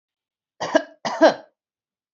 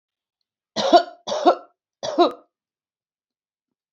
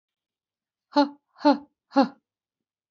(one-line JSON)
{"cough_length": "2.1 s", "cough_amplitude": 26585, "cough_signal_mean_std_ratio": 0.29, "three_cough_length": "3.9 s", "three_cough_amplitude": 28614, "three_cough_signal_mean_std_ratio": 0.3, "exhalation_length": "2.9 s", "exhalation_amplitude": 16707, "exhalation_signal_mean_std_ratio": 0.26, "survey_phase": "beta (2021-08-13 to 2022-03-07)", "age": "45-64", "gender": "Female", "wearing_mask": "No", "symptom_none": true, "smoker_status": "Current smoker (1 to 10 cigarettes per day)", "respiratory_condition_asthma": false, "respiratory_condition_other": false, "recruitment_source": "REACT", "submission_delay": "2 days", "covid_test_result": "Negative", "covid_test_method": "RT-qPCR", "influenza_a_test_result": "Negative", "influenza_b_test_result": "Negative"}